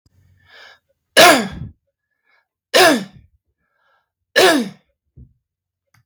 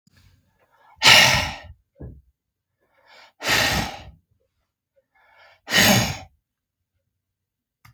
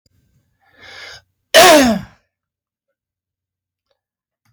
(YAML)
three_cough_length: 6.1 s
three_cough_amplitude: 32768
three_cough_signal_mean_std_ratio: 0.31
exhalation_length: 7.9 s
exhalation_amplitude: 32768
exhalation_signal_mean_std_ratio: 0.32
cough_length: 4.5 s
cough_amplitude: 32768
cough_signal_mean_std_ratio: 0.28
survey_phase: beta (2021-08-13 to 2022-03-07)
age: 65+
gender: Male
wearing_mask: 'No'
symptom_none: true
smoker_status: Never smoked
respiratory_condition_asthma: false
respiratory_condition_other: false
recruitment_source: REACT
submission_delay: 0 days
covid_test_result: Negative
covid_test_method: RT-qPCR
influenza_a_test_result: Negative
influenza_b_test_result: Negative